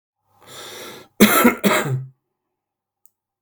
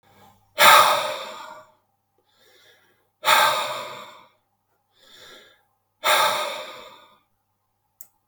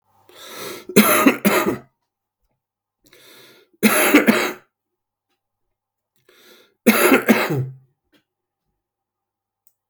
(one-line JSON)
{"cough_length": "3.4 s", "cough_amplitude": 32768, "cough_signal_mean_std_ratio": 0.37, "exhalation_length": "8.3 s", "exhalation_amplitude": 32768, "exhalation_signal_mean_std_ratio": 0.34, "three_cough_length": "9.9 s", "three_cough_amplitude": 32768, "three_cough_signal_mean_std_ratio": 0.36, "survey_phase": "beta (2021-08-13 to 2022-03-07)", "age": "45-64", "gender": "Male", "wearing_mask": "No", "symptom_sore_throat": true, "symptom_onset": "9 days", "smoker_status": "Ex-smoker", "respiratory_condition_asthma": true, "respiratory_condition_other": false, "recruitment_source": "REACT", "submission_delay": "1 day", "covid_test_result": "Negative", "covid_test_method": "RT-qPCR"}